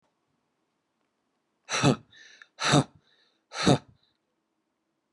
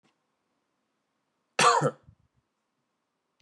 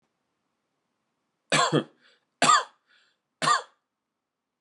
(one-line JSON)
{"exhalation_length": "5.1 s", "exhalation_amplitude": 14919, "exhalation_signal_mean_std_ratio": 0.27, "cough_length": "3.4 s", "cough_amplitude": 12408, "cough_signal_mean_std_ratio": 0.24, "three_cough_length": "4.6 s", "three_cough_amplitude": 15423, "three_cough_signal_mean_std_ratio": 0.3, "survey_phase": "beta (2021-08-13 to 2022-03-07)", "age": "18-44", "gender": "Male", "wearing_mask": "No", "symptom_none": true, "smoker_status": "Never smoked", "respiratory_condition_asthma": false, "respiratory_condition_other": false, "recruitment_source": "REACT", "submission_delay": "1 day", "covid_test_result": "Negative", "covid_test_method": "RT-qPCR"}